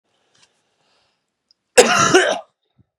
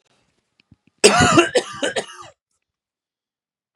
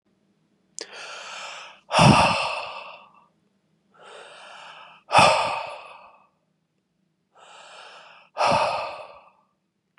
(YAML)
cough_length: 3.0 s
cough_amplitude: 32768
cough_signal_mean_std_ratio: 0.34
three_cough_length: 3.8 s
three_cough_amplitude: 32768
three_cough_signal_mean_std_ratio: 0.33
exhalation_length: 10.0 s
exhalation_amplitude: 30658
exhalation_signal_mean_std_ratio: 0.36
survey_phase: beta (2021-08-13 to 2022-03-07)
age: 18-44
gender: Male
wearing_mask: 'No'
symptom_cough_any: true
symptom_new_continuous_cough: true
symptom_abdominal_pain: true
symptom_fatigue: true
symptom_fever_high_temperature: true
symptom_headache: true
symptom_onset: 2 days
smoker_status: Ex-smoker
respiratory_condition_asthma: false
respiratory_condition_other: false
recruitment_source: Test and Trace
submission_delay: 1 day
covid_test_result: Positive
covid_test_method: RT-qPCR
covid_ct_value: 22.6
covid_ct_gene: ORF1ab gene
covid_ct_mean: 23.2
covid_viral_load: 24000 copies/ml
covid_viral_load_category: Low viral load (10K-1M copies/ml)